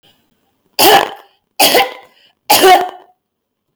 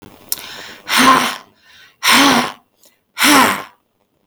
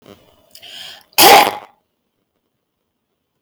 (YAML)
three_cough_length: 3.8 s
three_cough_amplitude: 32768
three_cough_signal_mean_std_ratio: 0.44
exhalation_length: 4.3 s
exhalation_amplitude: 32768
exhalation_signal_mean_std_ratio: 0.48
cough_length: 3.4 s
cough_amplitude: 32768
cough_signal_mean_std_ratio: 0.28
survey_phase: beta (2021-08-13 to 2022-03-07)
age: 45-64
gender: Female
wearing_mask: 'No'
symptom_none: true
smoker_status: Never smoked
respiratory_condition_asthma: false
respiratory_condition_other: false
recruitment_source: REACT
submission_delay: 2 days
covid_test_result: Negative
covid_test_method: RT-qPCR